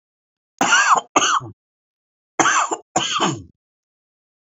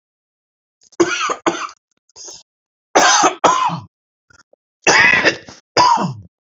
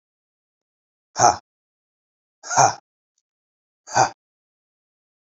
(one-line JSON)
{"cough_length": "4.5 s", "cough_amplitude": 29706, "cough_signal_mean_std_ratio": 0.45, "three_cough_length": "6.6 s", "three_cough_amplitude": 32233, "three_cough_signal_mean_std_ratio": 0.46, "exhalation_length": "5.2 s", "exhalation_amplitude": 28631, "exhalation_signal_mean_std_ratio": 0.24, "survey_phase": "beta (2021-08-13 to 2022-03-07)", "age": "45-64", "gender": "Male", "wearing_mask": "No", "symptom_none": true, "smoker_status": "Never smoked", "respiratory_condition_asthma": false, "respiratory_condition_other": false, "recruitment_source": "REACT", "submission_delay": "2 days", "covid_test_result": "Negative", "covid_test_method": "RT-qPCR", "influenza_a_test_result": "Negative", "influenza_b_test_result": "Negative"}